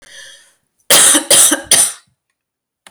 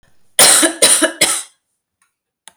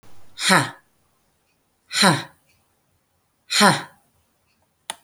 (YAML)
cough_length: 2.9 s
cough_amplitude: 32768
cough_signal_mean_std_ratio: 0.45
three_cough_length: 2.6 s
three_cough_amplitude: 32768
three_cough_signal_mean_std_ratio: 0.46
exhalation_length: 5.0 s
exhalation_amplitude: 30561
exhalation_signal_mean_std_ratio: 0.32
survey_phase: beta (2021-08-13 to 2022-03-07)
age: 45-64
gender: Female
wearing_mask: 'No'
symptom_none: true
smoker_status: Ex-smoker
respiratory_condition_asthma: false
respiratory_condition_other: false
recruitment_source: REACT
submission_delay: 5 days
covid_test_result: Negative
covid_test_method: RT-qPCR